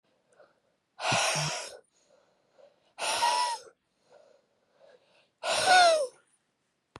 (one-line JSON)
{"exhalation_length": "7.0 s", "exhalation_amplitude": 11774, "exhalation_signal_mean_std_ratio": 0.4, "survey_phase": "beta (2021-08-13 to 2022-03-07)", "age": "18-44", "gender": "Female", "wearing_mask": "No", "symptom_runny_or_blocked_nose": true, "symptom_sore_throat": true, "symptom_abdominal_pain": true, "symptom_fatigue": true, "symptom_fever_high_temperature": true, "symptom_headache": true, "smoker_status": "Ex-smoker", "respiratory_condition_asthma": true, "respiratory_condition_other": false, "recruitment_source": "Test and Trace", "submission_delay": "1 day", "covid_test_result": "Positive", "covid_test_method": "RT-qPCR", "covid_ct_value": 25.4, "covid_ct_gene": "ORF1ab gene", "covid_ct_mean": 26.0, "covid_viral_load": "3000 copies/ml", "covid_viral_load_category": "Minimal viral load (< 10K copies/ml)"}